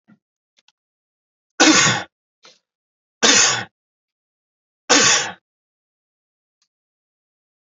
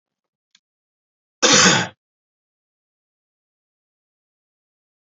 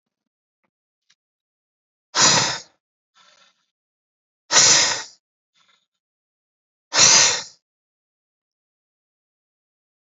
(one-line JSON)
{"three_cough_length": "7.7 s", "three_cough_amplitude": 32768, "three_cough_signal_mean_std_ratio": 0.31, "cough_length": "5.1 s", "cough_amplitude": 30950, "cough_signal_mean_std_ratio": 0.22, "exhalation_length": "10.2 s", "exhalation_amplitude": 30356, "exhalation_signal_mean_std_ratio": 0.28, "survey_phase": "beta (2021-08-13 to 2022-03-07)", "age": "45-64", "gender": "Male", "wearing_mask": "No", "symptom_none": true, "smoker_status": "Never smoked", "respiratory_condition_asthma": false, "respiratory_condition_other": false, "recruitment_source": "REACT", "submission_delay": "1 day", "covid_test_result": "Negative", "covid_test_method": "RT-qPCR"}